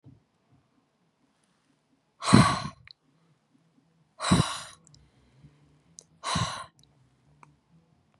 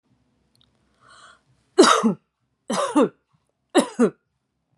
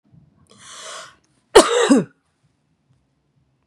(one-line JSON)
{"exhalation_length": "8.2 s", "exhalation_amplitude": 27711, "exhalation_signal_mean_std_ratio": 0.25, "three_cough_length": "4.8 s", "three_cough_amplitude": 26778, "three_cough_signal_mean_std_ratio": 0.33, "cough_length": "3.7 s", "cough_amplitude": 32768, "cough_signal_mean_std_ratio": 0.28, "survey_phase": "beta (2021-08-13 to 2022-03-07)", "age": "18-44", "gender": "Female", "wearing_mask": "No", "symptom_none": true, "smoker_status": "Never smoked", "respiratory_condition_asthma": false, "respiratory_condition_other": false, "recruitment_source": "REACT", "submission_delay": "1 day", "covid_test_result": "Negative", "covid_test_method": "RT-qPCR", "influenza_a_test_result": "Unknown/Void", "influenza_b_test_result": "Unknown/Void"}